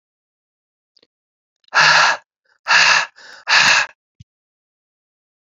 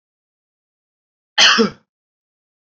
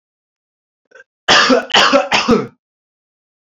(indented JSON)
{
  "exhalation_length": "5.5 s",
  "exhalation_amplitude": 29813,
  "exhalation_signal_mean_std_ratio": 0.38,
  "cough_length": "2.7 s",
  "cough_amplitude": 31656,
  "cough_signal_mean_std_ratio": 0.27,
  "three_cough_length": "3.4 s",
  "three_cough_amplitude": 31655,
  "three_cough_signal_mean_std_ratio": 0.45,
  "survey_phase": "alpha (2021-03-01 to 2021-08-12)",
  "age": "18-44",
  "gender": "Male",
  "wearing_mask": "No",
  "symptom_none": true,
  "smoker_status": "Never smoked",
  "respiratory_condition_asthma": false,
  "respiratory_condition_other": false,
  "recruitment_source": "REACT",
  "submission_delay": "1 day",
  "covid_test_result": "Negative",
  "covid_test_method": "RT-qPCR"
}